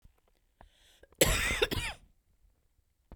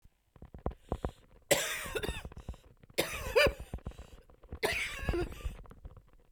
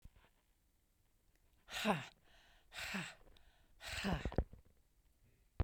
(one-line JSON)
{"cough_length": "3.2 s", "cough_amplitude": 12833, "cough_signal_mean_std_ratio": 0.35, "three_cough_length": "6.3 s", "three_cough_amplitude": 8741, "three_cough_signal_mean_std_ratio": 0.49, "exhalation_length": "5.6 s", "exhalation_amplitude": 2741, "exhalation_signal_mean_std_ratio": 0.37, "survey_phase": "beta (2021-08-13 to 2022-03-07)", "age": "45-64", "gender": "Female", "wearing_mask": "No", "symptom_cough_any": true, "symptom_runny_or_blocked_nose": true, "symptom_sore_throat": true, "symptom_fatigue": true, "symptom_change_to_sense_of_smell_or_taste": true, "symptom_loss_of_taste": true, "symptom_onset": "7 days", "smoker_status": "Never smoked", "respiratory_condition_asthma": false, "respiratory_condition_other": false, "recruitment_source": "Test and Trace", "submission_delay": "3 days", "covid_test_result": "Positive", "covid_test_method": "RT-qPCR", "covid_ct_value": 18.3, "covid_ct_gene": "ORF1ab gene"}